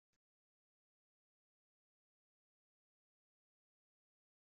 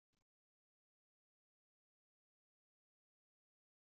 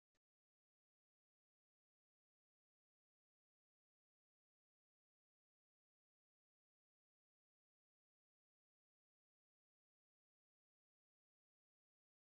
{
  "cough_length": "4.4 s",
  "cough_amplitude": 8,
  "cough_signal_mean_std_ratio": 0.06,
  "exhalation_length": "3.9 s",
  "exhalation_amplitude": 7,
  "exhalation_signal_mean_std_ratio": 0.08,
  "three_cough_length": "12.4 s",
  "three_cough_amplitude": 7,
  "three_cough_signal_mean_std_ratio": 0.03,
  "survey_phase": "beta (2021-08-13 to 2022-03-07)",
  "age": "18-44",
  "gender": "Female",
  "wearing_mask": "No",
  "symptom_none": true,
  "smoker_status": "Current smoker (e-cigarettes or vapes only)",
  "respiratory_condition_asthma": false,
  "respiratory_condition_other": false,
  "recruitment_source": "Test and Trace",
  "submission_delay": "1 day",
  "covid_test_result": "Positive",
  "covid_test_method": "RT-qPCR",
  "covid_ct_value": 32.5,
  "covid_ct_gene": "ORF1ab gene",
  "covid_ct_mean": 33.2,
  "covid_viral_load": "12 copies/ml",
  "covid_viral_load_category": "Minimal viral load (< 10K copies/ml)"
}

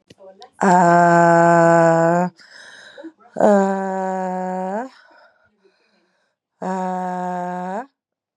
{
  "exhalation_length": "8.4 s",
  "exhalation_amplitude": 31768,
  "exhalation_signal_mean_std_ratio": 0.54,
  "survey_phase": "beta (2021-08-13 to 2022-03-07)",
  "age": "45-64",
  "gender": "Female",
  "wearing_mask": "No",
  "symptom_cough_any": true,
  "symptom_runny_or_blocked_nose": true,
  "symptom_sore_throat": true,
  "symptom_headache": true,
  "symptom_onset": "3 days",
  "smoker_status": "Current smoker (1 to 10 cigarettes per day)",
  "recruitment_source": "Test and Trace",
  "submission_delay": "2 days",
  "covid_test_result": "Positive",
  "covid_test_method": "RT-qPCR",
  "covid_ct_value": 21.6,
  "covid_ct_gene": "ORF1ab gene",
  "covid_ct_mean": 21.8,
  "covid_viral_load": "70000 copies/ml",
  "covid_viral_load_category": "Low viral load (10K-1M copies/ml)"
}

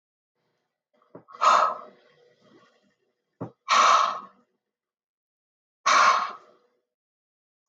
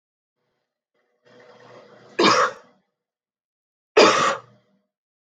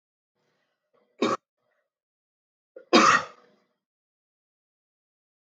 {
  "exhalation_length": "7.7 s",
  "exhalation_amplitude": 15050,
  "exhalation_signal_mean_std_ratio": 0.33,
  "three_cough_length": "5.2 s",
  "three_cough_amplitude": 26398,
  "three_cough_signal_mean_std_ratio": 0.3,
  "cough_length": "5.5 s",
  "cough_amplitude": 20582,
  "cough_signal_mean_std_ratio": 0.22,
  "survey_phase": "alpha (2021-03-01 to 2021-08-12)",
  "age": "45-64",
  "gender": "Female",
  "wearing_mask": "No",
  "symptom_none": true,
  "smoker_status": "Never smoked",
  "respiratory_condition_asthma": false,
  "respiratory_condition_other": false,
  "recruitment_source": "REACT",
  "submission_delay": "1 day",
  "covid_test_result": "Negative",
  "covid_test_method": "RT-qPCR"
}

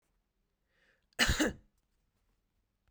{
  "cough_length": "2.9 s",
  "cough_amplitude": 7276,
  "cough_signal_mean_std_ratio": 0.26,
  "survey_phase": "beta (2021-08-13 to 2022-03-07)",
  "age": "18-44",
  "gender": "Female",
  "wearing_mask": "No",
  "symptom_cough_any": true,
  "symptom_runny_or_blocked_nose": true,
  "symptom_shortness_of_breath": true,
  "symptom_sore_throat": true,
  "symptom_fatigue": true,
  "symptom_headache": true,
  "symptom_change_to_sense_of_smell_or_taste": true,
  "smoker_status": "Ex-smoker",
  "respiratory_condition_asthma": false,
  "respiratory_condition_other": false,
  "recruitment_source": "Test and Trace",
  "submission_delay": "0 days",
  "covid_test_result": "Positive",
  "covid_test_method": "LFT"
}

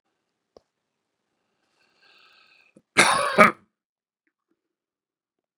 {
  "cough_length": "5.6 s",
  "cough_amplitude": 32767,
  "cough_signal_mean_std_ratio": 0.2,
  "survey_phase": "beta (2021-08-13 to 2022-03-07)",
  "age": "65+",
  "gender": "Male",
  "wearing_mask": "No",
  "symptom_cough_any": true,
  "smoker_status": "Ex-smoker",
  "respiratory_condition_asthma": false,
  "respiratory_condition_other": false,
  "recruitment_source": "REACT",
  "submission_delay": "3 days",
  "covid_test_result": "Negative",
  "covid_test_method": "RT-qPCR",
  "influenza_a_test_result": "Negative",
  "influenza_b_test_result": "Negative"
}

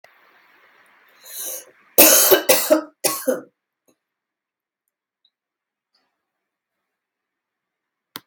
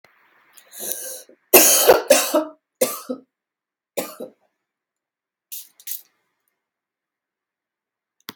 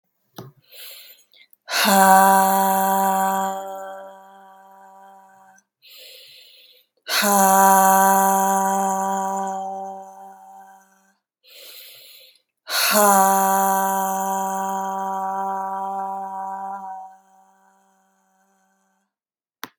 {
  "cough_length": "8.3 s",
  "cough_amplitude": 32768,
  "cough_signal_mean_std_ratio": 0.27,
  "three_cough_length": "8.4 s",
  "three_cough_amplitude": 32768,
  "three_cough_signal_mean_std_ratio": 0.28,
  "exhalation_length": "19.8 s",
  "exhalation_amplitude": 32767,
  "exhalation_signal_mean_std_ratio": 0.51,
  "survey_phase": "beta (2021-08-13 to 2022-03-07)",
  "age": "18-44",
  "gender": "Female",
  "wearing_mask": "No",
  "symptom_cough_any": true,
  "symptom_runny_or_blocked_nose": true,
  "symptom_sore_throat": true,
  "symptom_fatigue": true,
  "symptom_onset": "3 days",
  "smoker_status": "Never smoked",
  "respiratory_condition_asthma": false,
  "respiratory_condition_other": false,
  "recruitment_source": "Test and Trace",
  "submission_delay": "1 day",
  "covid_test_result": "Positive",
  "covid_test_method": "RT-qPCR",
  "covid_ct_value": 29.5,
  "covid_ct_gene": "N gene"
}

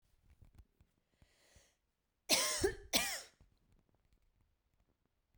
{
  "cough_length": "5.4 s",
  "cough_amplitude": 5793,
  "cough_signal_mean_std_ratio": 0.29,
  "survey_phase": "beta (2021-08-13 to 2022-03-07)",
  "age": "18-44",
  "gender": "Female",
  "wearing_mask": "No",
  "symptom_cough_any": true,
  "symptom_runny_or_blocked_nose": true,
  "symptom_shortness_of_breath": true,
  "symptom_fatigue": true,
  "symptom_headache": true,
  "symptom_change_to_sense_of_smell_or_taste": true,
  "symptom_loss_of_taste": true,
  "symptom_other": true,
  "symptom_onset": "3 days",
  "smoker_status": "Never smoked",
  "respiratory_condition_asthma": true,
  "respiratory_condition_other": false,
  "recruitment_source": "Test and Trace",
  "submission_delay": "2 days",
  "covid_test_result": "Positive",
  "covid_test_method": "RT-qPCR",
  "covid_ct_value": 18.8,
  "covid_ct_gene": "ORF1ab gene",
  "covid_ct_mean": 19.4,
  "covid_viral_load": "430000 copies/ml",
  "covid_viral_load_category": "Low viral load (10K-1M copies/ml)"
}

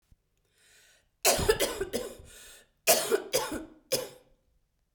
{
  "three_cough_length": "4.9 s",
  "three_cough_amplitude": 13731,
  "three_cough_signal_mean_std_ratio": 0.41,
  "survey_phase": "beta (2021-08-13 to 2022-03-07)",
  "age": "45-64",
  "gender": "Female",
  "wearing_mask": "No",
  "symptom_none": true,
  "smoker_status": "Never smoked",
  "respiratory_condition_asthma": false,
  "respiratory_condition_other": false,
  "recruitment_source": "REACT",
  "submission_delay": "1 day",
  "covid_test_result": "Negative",
  "covid_test_method": "RT-qPCR",
  "influenza_a_test_result": "Negative",
  "influenza_b_test_result": "Negative"
}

